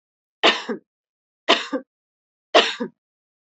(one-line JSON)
{"three_cough_length": "3.6 s", "three_cough_amplitude": 30236, "three_cough_signal_mean_std_ratio": 0.3, "survey_phase": "beta (2021-08-13 to 2022-03-07)", "age": "45-64", "gender": "Female", "wearing_mask": "No", "symptom_cough_any": true, "symptom_sore_throat": true, "symptom_onset": "12 days", "smoker_status": "Never smoked", "respiratory_condition_asthma": false, "respiratory_condition_other": false, "recruitment_source": "REACT", "submission_delay": "3 days", "covid_test_result": "Negative", "covid_test_method": "RT-qPCR", "covid_ct_value": 38.0, "covid_ct_gene": "N gene", "influenza_a_test_result": "Negative", "influenza_b_test_result": "Negative"}